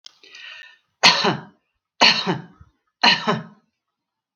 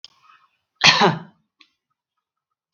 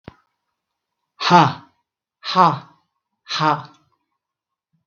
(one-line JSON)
{"three_cough_length": "4.4 s", "three_cough_amplitude": 32768, "three_cough_signal_mean_std_ratio": 0.36, "cough_length": "2.7 s", "cough_amplitude": 32768, "cough_signal_mean_std_ratio": 0.27, "exhalation_length": "4.9 s", "exhalation_amplitude": 32768, "exhalation_signal_mean_std_ratio": 0.3, "survey_phase": "beta (2021-08-13 to 2022-03-07)", "age": "65+", "gender": "Female", "wearing_mask": "No", "symptom_none": true, "smoker_status": "Never smoked", "respiratory_condition_asthma": false, "respiratory_condition_other": false, "recruitment_source": "Test and Trace", "submission_delay": "1 day", "covid_test_result": "Negative", "covid_test_method": "ePCR"}